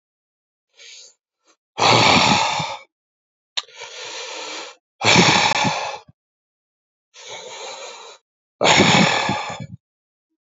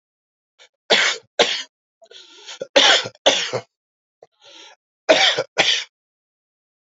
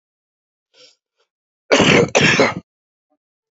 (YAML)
exhalation_length: 10.4 s
exhalation_amplitude: 31903
exhalation_signal_mean_std_ratio: 0.45
three_cough_length: 7.0 s
three_cough_amplitude: 30896
three_cough_signal_mean_std_ratio: 0.37
cough_length: 3.6 s
cough_amplitude: 29129
cough_signal_mean_std_ratio: 0.37
survey_phase: alpha (2021-03-01 to 2021-08-12)
age: 45-64
gender: Male
wearing_mask: 'No'
symptom_abdominal_pain: true
symptom_headache: true
smoker_status: Ex-smoker
respiratory_condition_asthma: false
respiratory_condition_other: true
recruitment_source: Test and Trace
submission_delay: 1 day
covid_test_result: Positive
covid_test_method: RT-qPCR
covid_ct_value: 25.3
covid_ct_gene: N gene